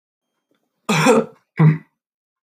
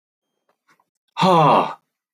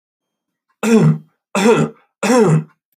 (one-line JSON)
{"cough_length": "2.5 s", "cough_amplitude": 29472, "cough_signal_mean_std_ratio": 0.39, "exhalation_length": "2.1 s", "exhalation_amplitude": 21666, "exhalation_signal_mean_std_ratio": 0.41, "three_cough_length": "3.0 s", "three_cough_amplitude": 27038, "three_cough_signal_mean_std_ratio": 0.54, "survey_phase": "beta (2021-08-13 to 2022-03-07)", "age": "45-64", "gender": "Male", "wearing_mask": "No", "symptom_sore_throat": true, "symptom_other": true, "symptom_onset": "3 days", "smoker_status": "Never smoked", "respiratory_condition_asthma": false, "respiratory_condition_other": false, "recruitment_source": "Test and Trace", "submission_delay": "2 days", "covid_test_result": "Positive", "covid_test_method": "RT-qPCR"}